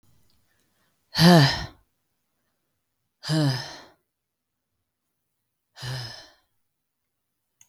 {"exhalation_length": "7.7 s", "exhalation_amplitude": 23554, "exhalation_signal_mean_std_ratio": 0.26, "survey_phase": "beta (2021-08-13 to 2022-03-07)", "age": "18-44", "gender": "Male", "wearing_mask": "No", "symptom_runny_or_blocked_nose": true, "symptom_onset": "71 days", "smoker_status": "Never smoked", "respiratory_condition_asthma": false, "respiratory_condition_other": false, "recruitment_source": "Test and Trace", "submission_delay": "68 days", "covid_test_method": "RT-qPCR"}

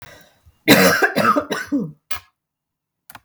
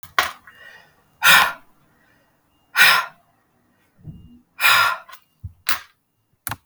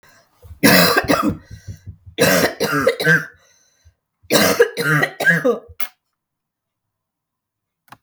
{"cough_length": "3.2 s", "cough_amplitude": 32768, "cough_signal_mean_std_ratio": 0.45, "exhalation_length": "6.7 s", "exhalation_amplitude": 32768, "exhalation_signal_mean_std_ratio": 0.34, "three_cough_length": "8.0 s", "three_cough_amplitude": 32768, "three_cough_signal_mean_std_ratio": 0.48, "survey_phase": "beta (2021-08-13 to 2022-03-07)", "age": "45-64", "gender": "Female", "wearing_mask": "No", "symptom_cough_any": true, "symptom_runny_or_blocked_nose": true, "smoker_status": "Ex-smoker", "respiratory_condition_asthma": false, "respiratory_condition_other": false, "recruitment_source": "REACT", "submission_delay": "7 days", "covid_test_result": "Negative", "covid_test_method": "RT-qPCR"}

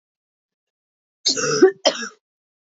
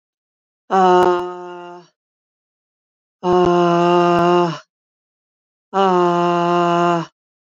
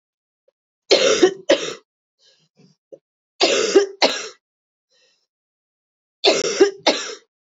{"cough_length": "2.7 s", "cough_amplitude": 28330, "cough_signal_mean_std_ratio": 0.32, "exhalation_length": "7.4 s", "exhalation_amplitude": 25662, "exhalation_signal_mean_std_ratio": 0.56, "three_cough_length": "7.6 s", "three_cough_amplitude": 28050, "three_cough_signal_mean_std_ratio": 0.37, "survey_phase": "beta (2021-08-13 to 2022-03-07)", "age": "45-64", "gender": "Female", "wearing_mask": "No", "symptom_cough_any": true, "symptom_runny_or_blocked_nose": true, "symptom_sore_throat": true, "symptom_headache": true, "symptom_other": true, "symptom_onset": "3 days", "smoker_status": "Never smoked", "respiratory_condition_asthma": false, "respiratory_condition_other": false, "recruitment_source": "Test and Trace", "submission_delay": "1 day", "covid_test_result": "Positive", "covid_test_method": "RT-qPCR", "covid_ct_value": 17.9, "covid_ct_gene": "N gene"}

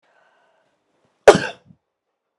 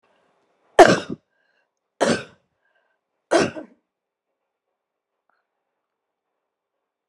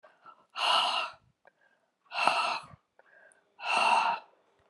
{"cough_length": "2.4 s", "cough_amplitude": 32768, "cough_signal_mean_std_ratio": 0.17, "three_cough_length": "7.1 s", "three_cough_amplitude": 32768, "three_cough_signal_mean_std_ratio": 0.19, "exhalation_length": "4.7 s", "exhalation_amplitude": 15138, "exhalation_signal_mean_std_ratio": 0.48, "survey_phase": "beta (2021-08-13 to 2022-03-07)", "age": "65+", "gender": "Female", "wearing_mask": "No", "symptom_cough_any": true, "symptom_fatigue": true, "symptom_fever_high_temperature": true, "symptom_headache": true, "symptom_change_to_sense_of_smell_or_taste": true, "symptom_loss_of_taste": true, "symptom_onset": "4 days", "smoker_status": "Ex-smoker", "respiratory_condition_asthma": false, "respiratory_condition_other": false, "recruitment_source": "Test and Trace", "submission_delay": "1 day", "covid_test_result": "Positive", "covid_test_method": "RT-qPCR", "covid_ct_value": 15.7, "covid_ct_gene": "ORF1ab gene"}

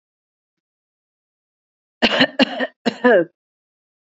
{"cough_length": "4.1 s", "cough_amplitude": 32768, "cough_signal_mean_std_ratio": 0.31, "survey_phase": "beta (2021-08-13 to 2022-03-07)", "age": "18-44", "gender": "Female", "wearing_mask": "No", "symptom_runny_or_blocked_nose": true, "symptom_shortness_of_breath": true, "symptom_headache": true, "symptom_onset": "3 days", "smoker_status": "Never smoked", "respiratory_condition_asthma": false, "respiratory_condition_other": false, "recruitment_source": "Test and Trace", "submission_delay": "1 day", "covid_test_result": "Positive", "covid_test_method": "RT-qPCR", "covid_ct_value": 29.4, "covid_ct_gene": "ORF1ab gene"}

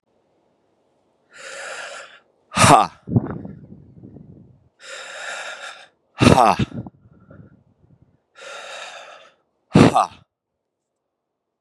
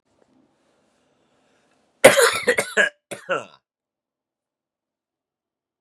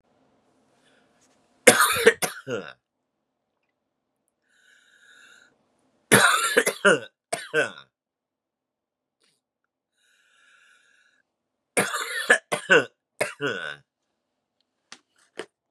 {"exhalation_length": "11.6 s", "exhalation_amplitude": 32768, "exhalation_signal_mean_std_ratio": 0.29, "cough_length": "5.8 s", "cough_amplitude": 32768, "cough_signal_mean_std_ratio": 0.25, "three_cough_length": "15.7 s", "three_cough_amplitude": 32767, "three_cough_signal_mean_std_ratio": 0.28, "survey_phase": "beta (2021-08-13 to 2022-03-07)", "age": "18-44", "gender": "Male", "wearing_mask": "No", "symptom_cough_any": true, "symptom_new_continuous_cough": true, "symptom_runny_or_blocked_nose": true, "symptom_sore_throat": true, "symptom_fatigue": true, "symptom_headache": true, "smoker_status": "Never smoked", "respiratory_condition_asthma": false, "respiratory_condition_other": false, "recruitment_source": "Test and Trace", "submission_delay": "2 days", "covid_test_result": "Positive", "covid_test_method": "RT-qPCR", "covid_ct_value": 21.4, "covid_ct_gene": "N gene"}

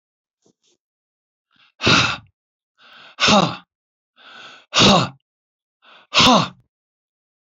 {"exhalation_length": "7.4 s", "exhalation_amplitude": 30053, "exhalation_signal_mean_std_ratio": 0.33, "survey_phase": "beta (2021-08-13 to 2022-03-07)", "age": "65+", "gender": "Male", "wearing_mask": "No", "symptom_none": true, "smoker_status": "Ex-smoker", "respiratory_condition_asthma": false, "respiratory_condition_other": false, "recruitment_source": "REACT", "submission_delay": "2 days", "covid_test_result": "Negative", "covid_test_method": "RT-qPCR"}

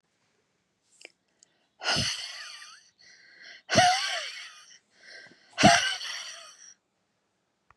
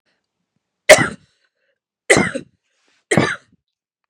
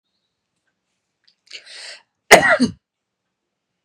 {"exhalation_length": "7.8 s", "exhalation_amplitude": 21248, "exhalation_signal_mean_std_ratio": 0.34, "three_cough_length": "4.1 s", "three_cough_amplitude": 32768, "three_cough_signal_mean_std_ratio": 0.27, "cough_length": "3.8 s", "cough_amplitude": 32768, "cough_signal_mean_std_ratio": 0.23, "survey_phase": "beta (2021-08-13 to 2022-03-07)", "age": "18-44", "gender": "Female", "wearing_mask": "No", "symptom_fatigue": true, "symptom_headache": true, "symptom_onset": "10 days", "smoker_status": "Never smoked", "respiratory_condition_asthma": false, "respiratory_condition_other": false, "recruitment_source": "REACT", "submission_delay": "2 days", "covid_test_result": "Negative", "covid_test_method": "RT-qPCR", "influenza_a_test_result": "Negative", "influenza_b_test_result": "Negative"}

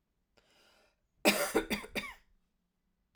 {"cough_length": "3.2 s", "cough_amplitude": 8531, "cough_signal_mean_std_ratio": 0.32, "survey_phase": "alpha (2021-03-01 to 2021-08-12)", "age": "45-64", "gender": "Female", "wearing_mask": "No", "symptom_cough_any": true, "symptom_fatigue": true, "symptom_fever_high_temperature": true, "symptom_onset": "3 days", "smoker_status": "Ex-smoker", "respiratory_condition_asthma": false, "respiratory_condition_other": false, "recruitment_source": "Test and Trace", "submission_delay": "1 day", "covid_test_result": "Positive", "covid_test_method": "RT-qPCR"}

